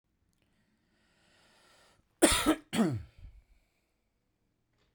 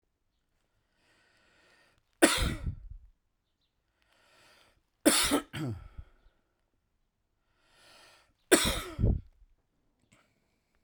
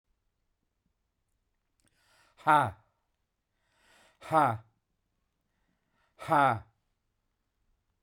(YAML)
cough_length: 4.9 s
cough_amplitude: 13628
cough_signal_mean_std_ratio: 0.27
three_cough_length: 10.8 s
three_cough_amplitude: 21450
three_cough_signal_mean_std_ratio: 0.28
exhalation_length: 8.0 s
exhalation_amplitude: 11415
exhalation_signal_mean_std_ratio: 0.24
survey_phase: beta (2021-08-13 to 2022-03-07)
age: 45-64
gender: Male
wearing_mask: 'No'
symptom_cough_any: true
symptom_runny_or_blocked_nose: true
symptom_change_to_sense_of_smell_or_taste: true
smoker_status: Ex-smoker
respiratory_condition_asthma: false
respiratory_condition_other: false
recruitment_source: Test and Trace
submission_delay: 1 day
covid_test_result: Positive
covid_test_method: RT-qPCR
covid_ct_value: 12.9
covid_ct_gene: ORF1ab gene
covid_ct_mean: 14.1
covid_viral_load: 23000000 copies/ml
covid_viral_load_category: High viral load (>1M copies/ml)